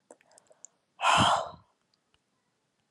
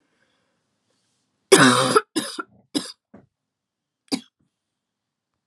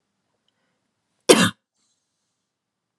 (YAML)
exhalation_length: 2.9 s
exhalation_amplitude: 8868
exhalation_signal_mean_std_ratio: 0.32
three_cough_length: 5.5 s
three_cough_amplitude: 32411
three_cough_signal_mean_std_ratio: 0.26
cough_length: 3.0 s
cough_amplitude: 32768
cough_signal_mean_std_ratio: 0.19
survey_phase: beta (2021-08-13 to 2022-03-07)
age: 18-44
gender: Female
wearing_mask: 'No'
symptom_none: true
smoker_status: Ex-smoker
respiratory_condition_asthma: false
respiratory_condition_other: false
recruitment_source: REACT
submission_delay: 3 days
covid_test_result: Negative
covid_test_method: RT-qPCR
influenza_a_test_result: Negative
influenza_b_test_result: Negative